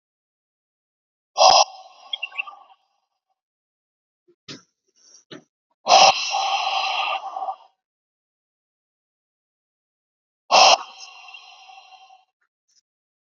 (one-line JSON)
{"exhalation_length": "13.3 s", "exhalation_amplitude": 32744, "exhalation_signal_mean_std_ratio": 0.29, "survey_phase": "beta (2021-08-13 to 2022-03-07)", "age": "18-44", "gender": "Male", "wearing_mask": "No", "symptom_none": true, "smoker_status": "Ex-smoker", "respiratory_condition_asthma": false, "respiratory_condition_other": false, "recruitment_source": "REACT", "submission_delay": "4 days", "covid_test_result": "Negative", "covid_test_method": "RT-qPCR", "influenza_a_test_result": "Negative", "influenza_b_test_result": "Negative"}